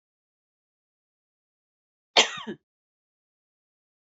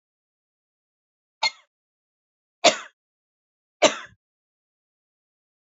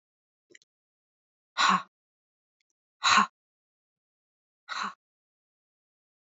{"cough_length": "4.1 s", "cough_amplitude": 22765, "cough_signal_mean_std_ratio": 0.14, "three_cough_length": "5.6 s", "three_cough_amplitude": 25710, "three_cough_signal_mean_std_ratio": 0.16, "exhalation_length": "6.4 s", "exhalation_amplitude": 12476, "exhalation_signal_mean_std_ratio": 0.23, "survey_phase": "alpha (2021-03-01 to 2021-08-12)", "age": "45-64", "gender": "Female", "wearing_mask": "No", "symptom_none": true, "smoker_status": "Never smoked", "respiratory_condition_asthma": false, "respiratory_condition_other": false, "recruitment_source": "REACT", "submission_delay": "1 day", "covid_test_result": "Negative", "covid_test_method": "RT-qPCR", "covid_ct_value": 46.0, "covid_ct_gene": "N gene"}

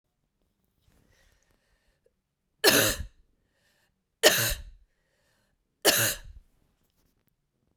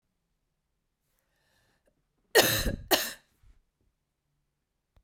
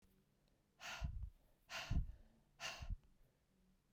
{"three_cough_length": "7.8 s", "three_cough_amplitude": 24154, "three_cough_signal_mean_std_ratio": 0.27, "cough_length": "5.0 s", "cough_amplitude": 18094, "cough_signal_mean_std_ratio": 0.24, "exhalation_length": "3.9 s", "exhalation_amplitude": 950, "exhalation_signal_mean_std_ratio": 0.44, "survey_phase": "beta (2021-08-13 to 2022-03-07)", "age": "45-64", "gender": "Female", "wearing_mask": "No", "symptom_cough_any": true, "symptom_runny_or_blocked_nose": true, "symptom_sore_throat": true, "symptom_abdominal_pain": true, "symptom_fever_high_temperature": true, "symptom_onset": "4 days", "smoker_status": "Never smoked", "respiratory_condition_asthma": false, "respiratory_condition_other": false, "recruitment_source": "Test and Trace", "submission_delay": "3 days", "covid_test_result": "Positive", "covid_test_method": "RT-qPCR", "covid_ct_value": 19.2, "covid_ct_gene": "ORF1ab gene", "covid_ct_mean": 19.9, "covid_viral_load": "310000 copies/ml", "covid_viral_load_category": "Low viral load (10K-1M copies/ml)"}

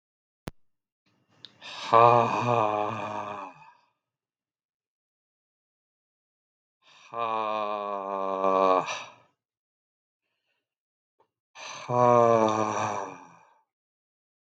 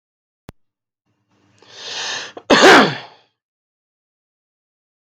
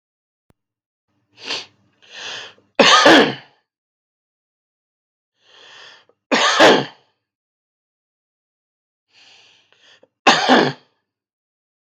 {"exhalation_length": "14.5 s", "exhalation_amplitude": 21212, "exhalation_signal_mean_std_ratio": 0.38, "cough_length": "5.0 s", "cough_amplitude": 32768, "cough_signal_mean_std_ratio": 0.27, "three_cough_length": "11.9 s", "three_cough_amplitude": 32768, "three_cough_signal_mean_std_ratio": 0.29, "survey_phase": "beta (2021-08-13 to 2022-03-07)", "age": "45-64", "gender": "Male", "wearing_mask": "No", "symptom_cough_any": true, "symptom_runny_or_blocked_nose": true, "symptom_sore_throat": true, "symptom_onset": "5 days", "smoker_status": "Never smoked", "respiratory_condition_asthma": false, "respiratory_condition_other": false, "recruitment_source": "REACT", "submission_delay": "3 days", "covid_test_result": "Negative", "covid_test_method": "RT-qPCR", "influenza_a_test_result": "Negative", "influenza_b_test_result": "Negative"}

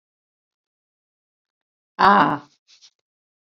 {"exhalation_length": "3.5 s", "exhalation_amplitude": 26814, "exhalation_signal_mean_std_ratio": 0.23, "survey_phase": "beta (2021-08-13 to 2022-03-07)", "age": "65+", "gender": "Female", "wearing_mask": "No", "symptom_none": true, "smoker_status": "Never smoked", "respiratory_condition_asthma": false, "respiratory_condition_other": false, "recruitment_source": "REACT", "submission_delay": "4 days", "covid_test_result": "Negative", "covid_test_method": "RT-qPCR"}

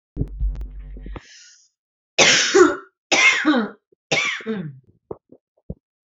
{"three_cough_length": "6.1 s", "three_cough_amplitude": 30620, "three_cough_signal_mean_std_ratio": 0.46, "survey_phase": "alpha (2021-03-01 to 2021-08-12)", "age": "18-44", "gender": "Female", "wearing_mask": "No", "symptom_shortness_of_breath": true, "symptom_fatigue": true, "smoker_status": "Ex-smoker", "respiratory_condition_asthma": false, "respiratory_condition_other": false, "recruitment_source": "REACT", "submission_delay": "1 day", "covid_test_result": "Negative", "covid_test_method": "RT-qPCR"}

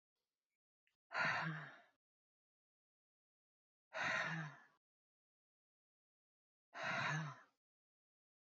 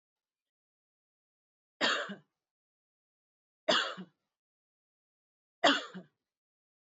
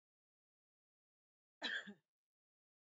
{"exhalation_length": "8.4 s", "exhalation_amplitude": 1409, "exhalation_signal_mean_std_ratio": 0.37, "three_cough_length": "6.8 s", "three_cough_amplitude": 9692, "three_cough_signal_mean_std_ratio": 0.24, "cough_length": "2.8 s", "cough_amplitude": 1208, "cough_signal_mean_std_ratio": 0.24, "survey_phase": "beta (2021-08-13 to 2022-03-07)", "age": "45-64", "gender": "Female", "wearing_mask": "No", "symptom_none": true, "smoker_status": "Never smoked", "respiratory_condition_asthma": false, "respiratory_condition_other": false, "recruitment_source": "REACT", "submission_delay": "2 days", "covid_test_result": "Negative", "covid_test_method": "RT-qPCR"}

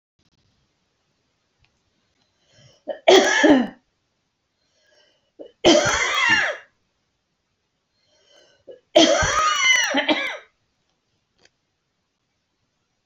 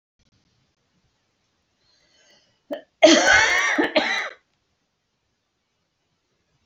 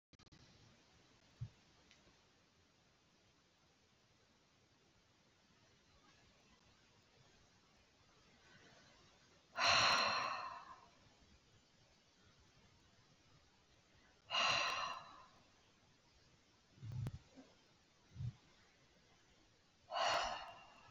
{"three_cough_length": "13.1 s", "three_cough_amplitude": 27707, "three_cough_signal_mean_std_ratio": 0.36, "cough_length": "6.7 s", "cough_amplitude": 27903, "cough_signal_mean_std_ratio": 0.32, "exhalation_length": "20.9 s", "exhalation_amplitude": 2775, "exhalation_signal_mean_std_ratio": 0.32, "survey_phase": "beta (2021-08-13 to 2022-03-07)", "age": "45-64", "gender": "Female", "wearing_mask": "No", "symptom_runny_or_blocked_nose": true, "symptom_fatigue": true, "symptom_headache": true, "smoker_status": "Ex-smoker", "respiratory_condition_asthma": false, "respiratory_condition_other": false, "recruitment_source": "REACT", "submission_delay": "3 days", "covid_test_result": "Negative", "covid_test_method": "RT-qPCR"}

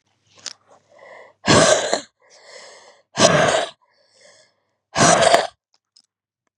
{"exhalation_length": "6.6 s", "exhalation_amplitude": 32768, "exhalation_signal_mean_std_ratio": 0.39, "survey_phase": "beta (2021-08-13 to 2022-03-07)", "age": "45-64", "gender": "Female", "wearing_mask": "No", "symptom_cough_any": true, "symptom_runny_or_blocked_nose": true, "symptom_shortness_of_breath": true, "symptom_fatigue": true, "symptom_headache": true, "smoker_status": "Ex-smoker", "respiratory_condition_asthma": false, "respiratory_condition_other": true, "recruitment_source": "Test and Trace", "submission_delay": "1 day", "covid_test_result": "Positive", "covid_test_method": "RT-qPCR", "covid_ct_value": 14.3, "covid_ct_gene": "ORF1ab gene"}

